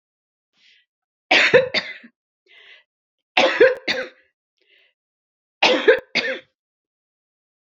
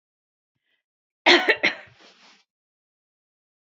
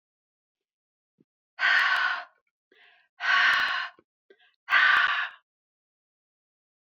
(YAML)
three_cough_length: 7.7 s
three_cough_amplitude: 32767
three_cough_signal_mean_std_ratio: 0.33
cough_length: 3.7 s
cough_amplitude: 25749
cough_signal_mean_std_ratio: 0.24
exhalation_length: 6.9 s
exhalation_amplitude: 12844
exhalation_signal_mean_std_ratio: 0.42
survey_phase: beta (2021-08-13 to 2022-03-07)
age: 65+
gender: Female
wearing_mask: 'No'
symptom_none: true
smoker_status: Never smoked
respiratory_condition_asthma: false
respiratory_condition_other: false
recruitment_source: REACT
submission_delay: 3 days
covid_test_result: Negative
covid_test_method: RT-qPCR
influenza_a_test_result: Negative
influenza_b_test_result: Negative